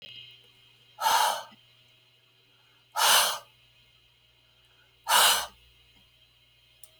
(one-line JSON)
{"exhalation_length": "7.0 s", "exhalation_amplitude": 12943, "exhalation_signal_mean_std_ratio": 0.35, "survey_phase": "alpha (2021-03-01 to 2021-08-12)", "age": "65+", "gender": "Female", "wearing_mask": "No", "symptom_none": true, "smoker_status": "Never smoked", "respiratory_condition_asthma": false, "respiratory_condition_other": true, "recruitment_source": "REACT", "submission_delay": "2 days", "covid_test_result": "Negative", "covid_test_method": "RT-qPCR"}